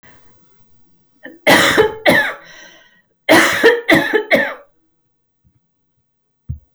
{"cough_length": "6.7 s", "cough_amplitude": 32768, "cough_signal_mean_std_ratio": 0.43, "survey_phase": "alpha (2021-03-01 to 2021-08-12)", "age": "18-44", "gender": "Female", "wearing_mask": "No", "symptom_none": true, "smoker_status": "Never smoked", "respiratory_condition_asthma": false, "respiratory_condition_other": false, "recruitment_source": "REACT", "submission_delay": "1 day", "covid_test_result": "Negative", "covid_test_method": "RT-qPCR"}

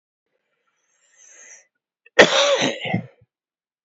{"cough_length": "3.8 s", "cough_amplitude": 29439, "cough_signal_mean_std_ratio": 0.31, "survey_phase": "beta (2021-08-13 to 2022-03-07)", "age": "45-64", "gender": "Male", "wearing_mask": "No", "symptom_runny_or_blocked_nose": true, "symptom_fatigue": true, "smoker_status": "Ex-smoker", "respiratory_condition_asthma": false, "respiratory_condition_other": false, "recruitment_source": "Test and Trace", "submission_delay": "1 day", "covid_test_result": "Positive", "covid_test_method": "RT-qPCR", "covid_ct_value": 25.2, "covid_ct_gene": "N gene"}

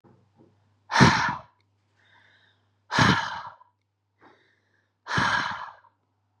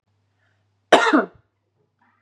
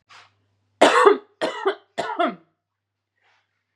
{"exhalation_length": "6.4 s", "exhalation_amplitude": 25854, "exhalation_signal_mean_std_ratio": 0.34, "cough_length": "2.2 s", "cough_amplitude": 32746, "cough_signal_mean_std_ratio": 0.28, "three_cough_length": "3.8 s", "three_cough_amplitude": 32676, "three_cough_signal_mean_std_ratio": 0.35, "survey_phase": "beta (2021-08-13 to 2022-03-07)", "age": "18-44", "gender": "Female", "wearing_mask": "No", "symptom_none": true, "symptom_onset": "7 days", "smoker_status": "Never smoked", "respiratory_condition_asthma": true, "respiratory_condition_other": false, "recruitment_source": "REACT", "submission_delay": "3 days", "covid_test_result": "Negative", "covid_test_method": "RT-qPCR", "influenza_a_test_result": "Negative", "influenza_b_test_result": "Negative"}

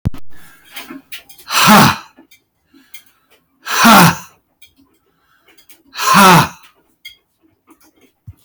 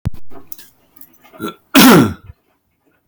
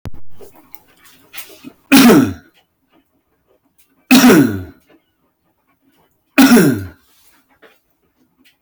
{"exhalation_length": "8.4 s", "exhalation_amplitude": 32768, "exhalation_signal_mean_std_ratio": 0.38, "cough_length": "3.1 s", "cough_amplitude": 32768, "cough_signal_mean_std_ratio": 0.39, "three_cough_length": "8.6 s", "three_cough_amplitude": 32768, "three_cough_signal_mean_std_ratio": 0.36, "survey_phase": "beta (2021-08-13 to 2022-03-07)", "age": "18-44", "gender": "Male", "wearing_mask": "No", "symptom_none": true, "symptom_onset": "9 days", "smoker_status": "Ex-smoker", "respiratory_condition_asthma": false, "respiratory_condition_other": false, "recruitment_source": "REACT", "submission_delay": "9 days", "covid_test_result": "Negative", "covid_test_method": "RT-qPCR", "influenza_a_test_result": "Negative", "influenza_b_test_result": "Negative"}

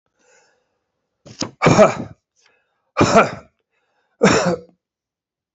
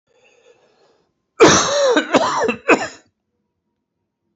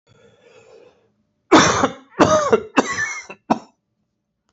{"exhalation_length": "5.5 s", "exhalation_amplitude": 28426, "exhalation_signal_mean_std_ratio": 0.34, "cough_length": "4.4 s", "cough_amplitude": 28636, "cough_signal_mean_std_ratio": 0.42, "three_cough_length": "4.5 s", "three_cough_amplitude": 32767, "three_cough_signal_mean_std_ratio": 0.39, "survey_phase": "beta (2021-08-13 to 2022-03-07)", "age": "45-64", "gender": "Male", "wearing_mask": "No", "symptom_cough_any": true, "symptom_runny_or_blocked_nose": true, "symptom_sore_throat": true, "symptom_abdominal_pain": true, "symptom_fatigue": true, "symptom_fever_high_temperature": true, "symptom_headache": true, "symptom_change_to_sense_of_smell_or_taste": true, "symptom_loss_of_taste": true, "symptom_onset": "3 days", "smoker_status": "Never smoked", "respiratory_condition_asthma": false, "respiratory_condition_other": false, "recruitment_source": "Test and Trace", "submission_delay": "2 days", "covid_test_result": "Positive", "covid_test_method": "RT-qPCR"}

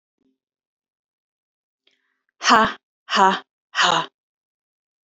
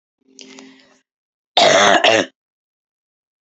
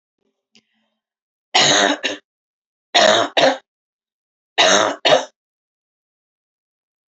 {"exhalation_length": "5.0 s", "exhalation_amplitude": 27952, "exhalation_signal_mean_std_ratio": 0.3, "cough_length": "3.4 s", "cough_amplitude": 31118, "cough_signal_mean_std_ratio": 0.37, "three_cough_length": "7.1 s", "three_cough_amplitude": 32767, "three_cough_signal_mean_std_ratio": 0.38, "survey_phase": "beta (2021-08-13 to 2022-03-07)", "age": "45-64", "gender": "Female", "wearing_mask": "No", "symptom_cough_any": true, "symptom_runny_or_blocked_nose": true, "smoker_status": "Never smoked", "respiratory_condition_asthma": false, "respiratory_condition_other": false, "recruitment_source": "Test and Trace", "submission_delay": "2 days", "covid_test_result": "Positive", "covid_test_method": "RT-qPCR", "covid_ct_value": 25.0, "covid_ct_gene": "ORF1ab gene"}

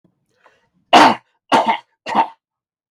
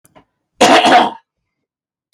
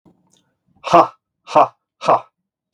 {"three_cough_length": "2.9 s", "three_cough_amplitude": 32768, "three_cough_signal_mean_std_ratio": 0.36, "cough_length": "2.1 s", "cough_amplitude": 32768, "cough_signal_mean_std_ratio": 0.42, "exhalation_length": "2.7 s", "exhalation_amplitude": 32768, "exhalation_signal_mean_std_ratio": 0.31, "survey_phase": "beta (2021-08-13 to 2022-03-07)", "age": "45-64", "gender": "Male", "wearing_mask": "No", "symptom_none": true, "smoker_status": "Never smoked", "respiratory_condition_asthma": false, "respiratory_condition_other": false, "recruitment_source": "REACT", "submission_delay": "2 days", "covid_test_result": "Negative", "covid_test_method": "RT-qPCR", "influenza_a_test_result": "Negative", "influenza_b_test_result": "Negative"}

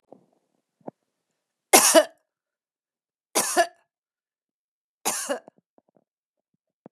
{"three_cough_length": "6.9 s", "three_cough_amplitude": 32767, "three_cough_signal_mean_std_ratio": 0.23, "survey_phase": "beta (2021-08-13 to 2022-03-07)", "age": "45-64", "gender": "Female", "wearing_mask": "No", "symptom_none": true, "smoker_status": "Never smoked", "respiratory_condition_asthma": false, "respiratory_condition_other": false, "recruitment_source": "REACT", "submission_delay": "1 day", "covid_test_result": "Negative", "covid_test_method": "RT-qPCR", "influenza_a_test_result": "Negative", "influenza_b_test_result": "Negative"}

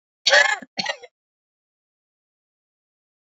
{"cough_length": "3.3 s", "cough_amplitude": 24965, "cough_signal_mean_std_ratio": 0.25, "survey_phase": "beta (2021-08-13 to 2022-03-07)", "age": "45-64", "gender": "Female", "wearing_mask": "No", "symptom_cough_any": true, "symptom_sore_throat": true, "symptom_diarrhoea": true, "smoker_status": "Ex-smoker", "respiratory_condition_asthma": false, "respiratory_condition_other": false, "recruitment_source": "Test and Trace", "submission_delay": "2 days", "covid_test_result": "Positive", "covid_test_method": "RT-qPCR", "covid_ct_value": 34.4, "covid_ct_gene": "ORF1ab gene", "covid_ct_mean": 34.4, "covid_viral_load": "5.3 copies/ml", "covid_viral_load_category": "Minimal viral load (< 10K copies/ml)"}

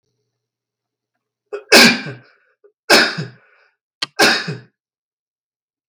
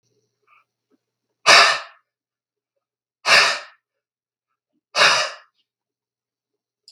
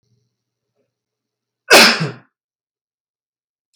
{"three_cough_length": "5.9 s", "three_cough_amplitude": 32768, "three_cough_signal_mean_std_ratio": 0.31, "exhalation_length": "6.9 s", "exhalation_amplitude": 32768, "exhalation_signal_mean_std_ratio": 0.28, "cough_length": "3.8 s", "cough_amplitude": 32768, "cough_signal_mean_std_ratio": 0.24, "survey_phase": "beta (2021-08-13 to 2022-03-07)", "age": "45-64", "gender": "Male", "wearing_mask": "No", "symptom_none": true, "smoker_status": "Never smoked", "respiratory_condition_asthma": false, "respiratory_condition_other": false, "recruitment_source": "REACT", "submission_delay": "5 days", "covid_test_result": "Negative", "covid_test_method": "RT-qPCR", "influenza_a_test_result": "Negative", "influenza_b_test_result": "Negative"}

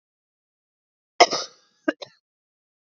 {"cough_length": "3.0 s", "cough_amplitude": 29493, "cough_signal_mean_std_ratio": 0.17, "survey_phase": "beta (2021-08-13 to 2022-03-07)", "age": "45-64", "gender": "Female", "wearing_mask": "No", "symptom_cough_any": true, "symptom_runny_or_blocked_nose": true, "symptom_sore_throat": true, "symptom_fatigue": true, "symptom_fever_high_temperature": true, "symptom_headache": true, "symptom_change_to_sense_of_smell_or_taste": true, "symptom_onset": "4 days", "smoker_status": "Never smoked", "respiratory_condition_asthma": false, "respiratory_condition_other": false, "recruitment_source": "Test and Trace", "submission_delay": "2 days", "covid_test_result": "Positive", "covid_test_method": "RT-qPCR", "covid_ct_value": 17.4, "covid_ct_gene": "ORF1ab gene", "covid_ct_mean": 17.7, "covid_viral_load": "1500000 copies/ml", "covid_viral_load_category": "High viral load (>1M copies/ml)"}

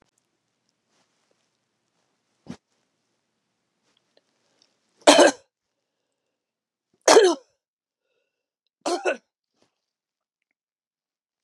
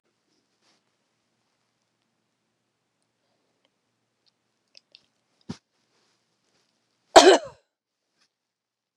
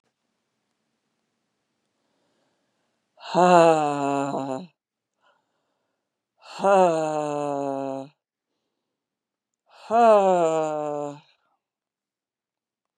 {"three_cough_length": "11.4 s", "three_cough_amplitude": 32767, "three_cough_signal_mean_std_ratio": 0.19, "cough_length": "9.0 s", "cough_amplitude": 32768, "cough_signal_mean_std_ratio": 0.12, "exhalation_length": "13.0 s", "exhalation_amplitude": 26252, "exhalation_signal_mean_std_ratio": 0.37, "survey_phase": "beta (2021-08-13 to 2022-03-07)", "age": "45-64", "gender": "Female", "wearing_mask": "No", "symptom_cough_any": true, "symptom_sore_throat": true, "symptom_fatigue": true, "symptom_headache": true, "symptom_onset": "3 days", "smoker_status": "Never smoked", "respiratory_condition_asthma": false, "respiratory_condition_other": false, "recruitment_source": "Test and Trace", "submission_delay": "2 days", "covid_test_result": "Positive", "covid_test_method": "RT-qPCR", "covid_ct_value": 24.6, "covid_ct_gene": "ORF1ab gene", "covid_ct_mean": 25.3, "covid_viral_load": "5200 copies/ml", "covid_viral_load_category": "Minimal viral load (< 10K copies/ml)"}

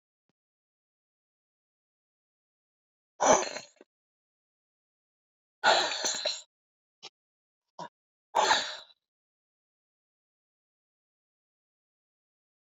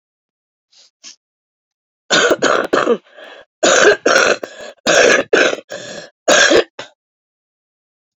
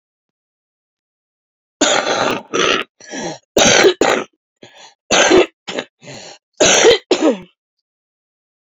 {"exhalation_length": "12.7 s", "exhalation_amplitude": 12526, "exhalation_signal_mean_std_ratio": 0.24, "three_cough_length": "8.2 s", "three_cough_amplitude": 32767, "three_cough_signal_mean_std_ratio": 0.46, "cough_length": "8.8 s", "cough_amplitude": 32768, "cough_signal_mean_std_ratio": 0.45, "survey_phase": "beta (2021-08-13 to 2022-03-07)", "age": "45-64", "gender": "Female", "wearing_mask": "No", "symptom_cough_any": true, "symptom_shortness_of_breath": true, "symptom_fatigue": true, "smoker_status": "Ex-smoker", "respiratory_condition_asthma": true, "respiratory_condition_other": false, "recruitment_source": "Test and Trace", "submission_delay": "2 days", "covid_test_result": "Positive", "covid_test_method": "RT-qPCR", "covid_ct_value": 17.8, "covid_ct_gene": "ORF1ab gene", "covid_ct_mean": 18.2, "covid_viral_load": "1100000 copies/ml", "covid_viral_load_category": "High viral load (>1M copies/ml)"}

